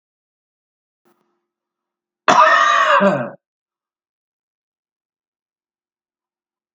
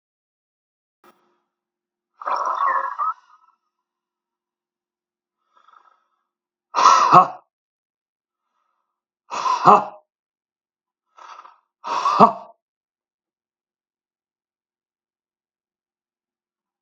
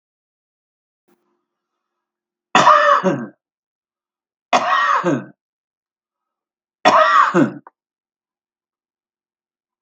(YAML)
cough_length: 6.7 s
cough_amplitude: 32767
cough_signal_mean_std_ratio: 0.31
exhalation_length: 16.8 s
exhalation_amplitude: 32768
exhalation_signal_mean_std_ratio: 0.25
three_cough_length: 9.8 s
three_cough_amplitude: 32767
three_cough_signal_mean_std_ratio: 0.35
survey_phase: beta (2021-08-13 to 2022-03-07)
age: 65+
gender: Male
wearing_mask: 'No'
symptom_shortness_of_breath: true
symptom_diarrhoea: true
symptom_fatigue: true
symptom_headache: true
symptom_onset: 12 days
smoker_status: Ex-smoker
respiratory_condition_asthma: false
respiratory_condition_other: true
recruitment_source: REACT
submission_delay: 1 day
covid_test_result: Negative
covid_test_method: RT-qPCR
influenza_a_test_result: Negative
influenza_b_test_result: Negative